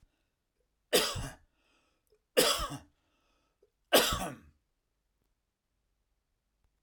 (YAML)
three_cough_length: 6.8 s
three_cough_amplitude: 13774
three_cough_signal_mean_std_ratio: 0.28
survey_phase: alpha (2021-03-01 to 2021-08-12)
age: 45-64
gender: Male
wearing_mask: 'No'
symptom_none: true
smoker_status: Never smoked
respiratory_condition_asthma: false
respiratory_condition_other: false
recruitment_source: REACT
submission_delay: 6 days
covid_test_result: Negative
covid_test_method: RT-qPCR